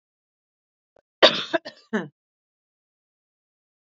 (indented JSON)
{
  "cough_length": "3.9 s",
  "cough_amplitude": 28762,
  "cough_signal_mean_std_ratio": 0.19,
  "survey_phase": "alpha (2021-03-01 to 2021-08-12)",
  "age": "45-64",
  "gender": "Female",
  "wearing_mask": "No",
  "symptom_none": true,
  "smoker_status": "Never smoked",
  "respiratory_condition_asthma": false,
  "respiratory_condition_other": false,
  "recruitment_source": "REACT",
  "submission_delay": "1 day",
  "covid_test_result": "Negative",
  "covid_test_method": "RT-qPCR"
}